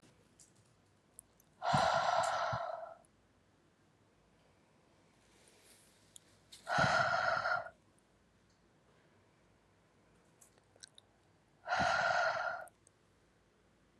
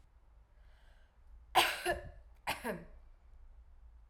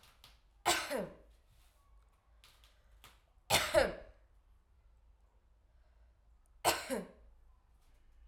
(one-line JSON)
{"exhalation_length": "14.0 s", "exhalation_amplitude": 3608, "exhalation_signal_mean_std_ratio": 0.41, "cough_length": "4.1 s", "cough_amplitude": 6468, "cough_signal_mean_std_ratio": 0.37, "three_cough_length": "8.3 s", "three_cough_amplitude": 5995, "three_cough_signal_mean_std_ratio": 0.31, "survey_phase": "alpha (2021-03-01 to 2021-08-12)", "age": "18-44", "gender": "Female", "wearing_mask": "No", "symptom_cough_any": true, "symptom_fatigue": true, "symptom_headache": true, "smoker_status": "Never smoked", "respiratory_condition_asthma": false, "respiratory_condition_other": false, "recruitment_source": "Test and Trace", "submission_delay": "2 days", "covid_test_result": "Positive", "covid_test_method": "RT-qPCR", "covid_ct_value": 27.6, "covid_ct_gene": "N gene"}